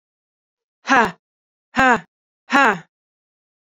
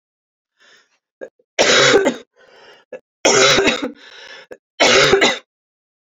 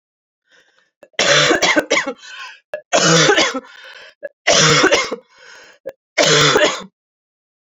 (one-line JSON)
{"exhalation_length": "3.8 s", "exhalation_amplitude": 32002, "exhalation_signal_mean_std_ratio": 0.3, "three_cough_length": "6.1 s", "three_cough_amplitude": 32768, "three_cough_signal_mean_std_ratio": 0.46, "cough_length": "7.8 s", "cough_amplitude": 32768, "cough_signal_mean_std_ratio": 0.52, "survey_phase": "alpha (2021-03-01 to 2021-08-12)", "age": "18-44", "gender": "Female", "wearing_mask": "No", "symptom_cough_any": true, "symptom_new_continuous_cough": true, "symptom_fatigue": true, "symptom_headache": true, "symptom_onset": "3 days", "smoker_status": "Never smoked", "respiratory_condition_asthma": false, "respiratory_condition_other": false, "recruitment_source": "Test and Trace", "submission_delay": "2 days", "covid_test_result": "Positive", "covid_test_method": "RT-qPCR", "covid_ct_value": 24.1, "covid_ct_gene": "ORF1ab gene", "covid_ct_mean": 24.4, "covid_viral_load": "9700 copies/ml", "covid_viral_load_category": "Minimal viral load (< 10K copies/ml)"}